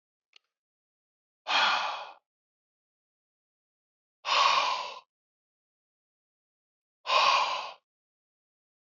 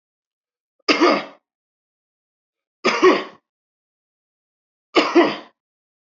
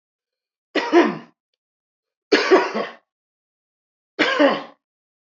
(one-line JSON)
{"exhalation_length": "9.0 s", "exhalation_amplitude": 9289, "exhalation_signal_mean_std_ratio": 0.35, "cough_length": "6.1 s", "cough_amplitude": 27093, "cough_signal_mean_std_ratio": 0.31, "three_cough_length": "5.4 s", "three_cough_amplitude": 25776, "three_cough_signal_mean_std_ratio": 0.37, "survey_phase": "alpha (2021-03-01 to 2021-08-12)", "age": "45-64", "gender": "Male", "wearing_mask": "No", "symptom_none": true, "smoker_status": "Ex-smoker", "respiratory_condition_asthma": false, "respiratory_condition_other": false, "recruitment_source": "REACT", "submission_delay": "1 day", "covid_test_result": "Negative", "covid_test_method": "RT-qPCR"}